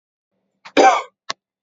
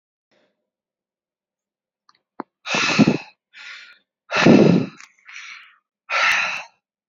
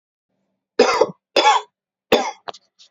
{
  "cough_length": "1.6 s",
  "cough_amplitude": 30327,
  "cough_signal_mean_std_ratio": 0.31,
  "exhalation_length": "7.1 s",
  "exhalation_amplitude": 28208,
  "exhalation_signal_mean_std_ratio": 0.35,
  "three_cough_length": "2.9 s",
  "three_cough_amplitude": 30062,
  "three_cough_signal_mean_std_ratio": 0.38,
  "survey_phase": "beta (2021-08-13 to 2022-03-07)",
  "age": "18-44",
  "gender": "Male",
  "wearing_mask": "No",
  "symptom_fatigue": true,
  "smoker_status": "Never smoked",
  "respiratory_condition_asthma": false,
  "respiratory_condition_other": false,
  "recruitment_source": "REACT",
  "submission_delay": "7 days",
  "covid_test_result": "Negative",
  "covid_test_method": "RT-qPCR",
  "influenza_a_test_result": "Negative",
  "influenza_b_test_result": "Negative"
}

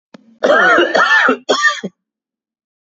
{
  "three_cough_length": "2.8 s",
  "three_cough_amplitude": 29537,
  "three_cough_signal_mean_std_ratio": 0.6,
  "survey_phase": "beta (2021-08-13 to 2022-03-07)",
  "age": "18-44",
  "gender": "Male",
  "wearing_mask": "No",
  "symptom_new_continuous_cough": true,
  "symptom_runny_or_blocked_nose": true,
  "symptom_shortness_of_breath": true,
  "symptom_diarrhoea": true,
  "symptom_fatigue": true,
  "symptom_headache": true,
  "symptom_onset": "6 days",
  "smoker_status": "Never smoked",
  "respiratory_condition_asthma": false,
  "respiratory_condition_other": false,
  "recruitment_source": "Test and Trace",
  "submission_delay": "1 day",
  "covid_test_result": "Positive",
  "covid_test_method": "RT-qPCR"
}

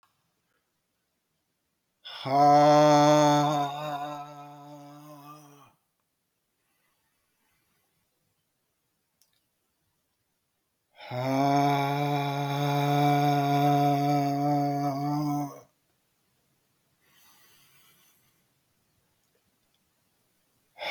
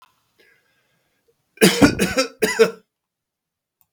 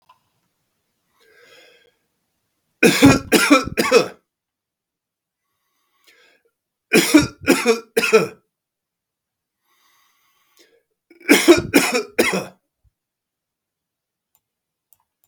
{
  "exhalation_length": "20.9 s",
  "exhalation_amplitude": 11806,
  "exhalation_signal_mean_std_ratio": 0.45,
  "cough_length": "3.9 s",
  "cough_amplitude": 32768,
  "cough_signal_mean_std_ratio": 0.33,
  "three_cough_length": "15.3 s",
  "three_cough_amplitude": 32768,
  "three_cough_signal_mean_std_ratio": 0.31,
  "survey_phase": "beta (2021-08-13 to 2022-03-07)",
  "age": "65+",
  "gender": "Male",
  "wearing_mask": "No",
  "symptom_runny_or_blocked_nose": true,
  "smoker_status": "Never smoked",
  "respiratory_condition_asthma": false,
  "respiratory_condition_other": false,
  "recruitment_source": "REACT",
  "submission_delay": "2 days",
  "covid_test_result": "Negative",
  "covid_test_method": "RT-qPCR"
}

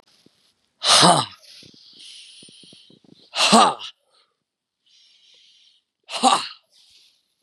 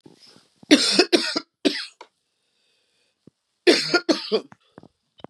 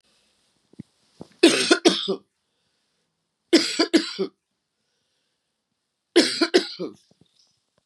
{
  "exhalation_length": "7.4 s",
  "exhalation_amplitude": 32767,
  "exhalation_signal_mean_std_ratio": 0.3,
  "cough_length": "5.3 s",
  "cough_amplitude": 30936,
  "cough_signal_mean_std_ratio": 0.35,
  "three_cough_length": "7.9 s",
  "three_cough_amplitude": 29759,
  "three_cough_signal_mean_std_ratio": 0.32,
  "survey_phase": "beta (2021-08-13 to 2022-03-07)",
  "age": "45-64",
  "gender": "Female",
  "wearing_mask": "No",
  "symptom_cough_any": true,
  "symptom_runny_or_blocked_nose": true,
  "symptom_shortness_of_breath": true,
  "symptom_headache": true,
  "smoker_status": "Never smoked",
  "respiratory_condition_asthma": false,
  "respiratory_condition_other": false,
  "recruitment_source": "Test and Trace",
  "submission_delay": "1 day",
  "covid_test_result": "Positive",
  "covid_test_method": "LFT"
}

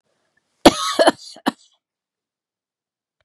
{
  "cough_length": "3.2 s",
  "cough_amplitude": 32768,
  "cough_signal_mean_std_ratio": 0.23,
  "survey_phase": "beta (2021-08-13 to 2022-03-07)",
  "age": "45-64",
  "gender": "Female",
  "wearing_mask": "No",
  "symptom_none": true,
  "smoker_status": "Never smoked",
  "respiratory_condition_asthma": false,
  "respiratory_condition_other": false,
  "recruitment_source": "REACT",
  "submission_delay": "1 day",
  "covid_test_result": "Negative",
  "covid_test_method": "RT-qPCR",
  "influenza_a_test_result": "Negative",
  "influenza_b_test_result": "Negative"
}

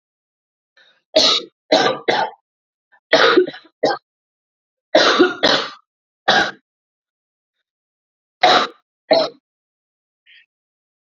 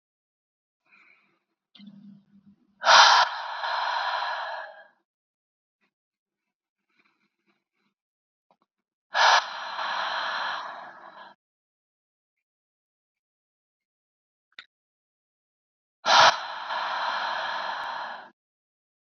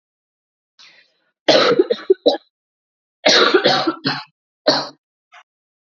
{
  "three_cough_length": "11.0 s",
  "three_cough_amplitude": 32767,
  "three_cough_signal_mean_std_ratio": 0.38,
  "exhalation_length": "19.0 s",
  "exhalation_amplitude": 25434,
  "exhalation_signal_mean_std_ratio": 0.33,
  "cough_length": "6.0 s",
  "cough_amplitude": 29701,
  "cough_signal_mean_std_ratio": 0.4,
  "survey_phase": "beta (2021-08-13 to 2022-03-07)",
  "age": "18-44",
  "gender": "Female",
  "wearing_mask": "No",
  "symptom_cough_any": true,
  "symptom_runny_or_blocked_nose": true,
  "symptom_shortness_of_breath": true,
  "symptom_fever_high_temperature": true,
  "symptom_other": true,
  "symptom_onset": "5 days",
  "smoker_status": "Never smoked",
  "respiratory_condition_asthma": false,
  "respiratory_condition_other": false,
  "recruitment_source": "Test and Trace",
  "submission_delay": "1 day",
  "covid_test_result": "Positive",
  "covid_test_method": "RT-qPCR",
  "covid_ct_value": 19.5,
  "covid_ct_gene": "N gene"
}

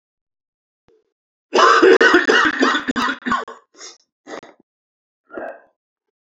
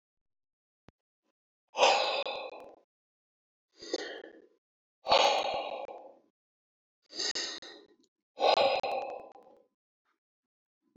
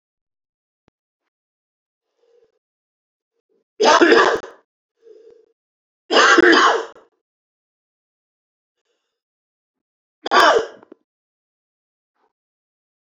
{
  "cough_length": "6.3 s",
  "cough_amplitude": 29083,
  "cough_signal_mean_std_ratio": 0.41,
  "exhalation_length": "11.0 s",
  "exhalation_amplitude": 9934,
  "exhalation_signal_mean_std_ratio": 0.37,
  "three_cough_length": "13.1 s",
  "three_cough_amplitude": 29857,
  "three_cough_signal_mean_std_ratio": 0.28,
  "survey_phase": "beta (2021-08-13 to 2022-03-07)",
  "age": "45-64",
  "gender": "Male",
  "wearing_mask": "No",
  "symptom_cough_any": true,
  "symptom_runny_or_blocked_nose": true,
  "symptom_fatigue": true,
  "symptom_fever_high_temperature": true,
  "symptom_loss_of_taste": true,
  "smoker_status": "Ex-smoker",
  "respiratory_condition_asthma": false,
  "respiratory_condition_other": false,
  "recruitment_source": "Test and Trace",
  "submission_delay": "2 days",
  "covid_test_result": "Positive",
  "covid_test_method": "LFT"
}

